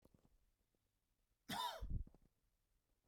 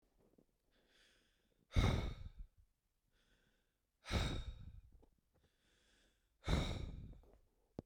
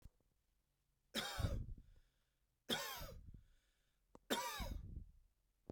{
  "cough_length": "3.1 s",
  "cough_amplitude": 718,
  "cough_signal_mean_std_ratio": 0.36,
  "exhalation_length": "7.9 s",
  "exhalation_amplitude": 2884,
  "exhalation_signal_mean_std_ratio": 0.35,
  "three_cough_length": "5.7 s",
  "three_cough_amplitude": 2161,
  "three_cough_signal_mean_std_ratio": 0.46,
  "survey_phase": "beta (2021-08-13 to 2022-03-07)",
  "age": "18-44",
  "gender": "Male",
  "wearing_mask": "No",
  "symptom_cough_any": true,
  "symptom_onset": "12 days",
  "smoker_status": "Never smoked",
  "respiratory_condition_asthma": false,
  "respiratory_condition_other": false,
  "recruitment_source": "REACT",
  "submission_delay": "3 days",
  "covid_test_result": "Negative",
  "covid_test_method": "RT-qPCR",
  "covid_ct_value": 39.0,
  "covid_ct_gene": "N gene",
  "influenza_a_test_result": "Negative",
  "influenza_b_test_result": "Negative"
}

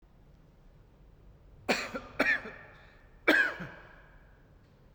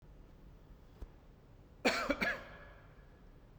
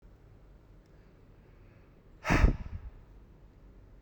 {
  "three_cough_length": "4.9 s",
  "three_cough_amplitude": 11827,
  "three_cough_signal_mean_std_ratio": 0.36,
  "cough_length": "3.6 s",
  "cough_amplitude": 4991,
  "cough_signal_mean_std_ratio": 0.42,
  "exhalation_length": "4.0 s",
  "exhalation_amplitude": 9650,
  "exhalation_signal_mean_std_ratio": 0.3,
  "survey_phase": "beta (2021-08-13 to 2022-03-07)",
  "age": "45-64",
  "gender": "Male",
  "wearing_mask": "No",
  "symptom_none": true,
  "smoker_status": "Never smoked",
  "respiratory_condition_asthma": false,
  "respiratory_condition_other": false,
  "recruitment_source": "REACT",
  "submission_delay": "2 days",
  "covid_test_result": "Negative",
  "covid_test_method": "RT-qPCR"
}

